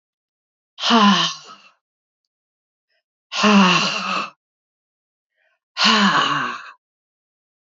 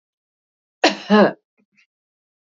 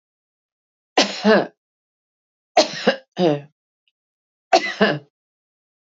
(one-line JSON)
{"exhalation_length": "7.8 s", "exhalation_amplitude": 26553, "exhalation_signal_mean_std_ratio": 0.42, "cough_length": "2.6 s", "cough_amplitude": 26912, "cough_signal_mean_std_ratio": 0.28, "three_cough_length": "5.9 s", "three_cough_amplitude": 30543, "three_cough_signal_mean_std_ratio": 0.33, "survey_phase": "beta (2021-08-13 to 2022-03-07)", "age": "45-64", "gender": "Female", "wearing_mask": "No", "symptom_none": true, "smoker_status": "Ex-smoker", "respiratory_condition_asthma": false, "respiratory_condition_other": false, "recruitment_source": "REACT", "submission_delay": "5 days", "covid_test_result": "Negative", "covid_test_method": "RT-qPCR", "influenza_a_test_result": "Negative", "influenza_b_test_result": "Negative"}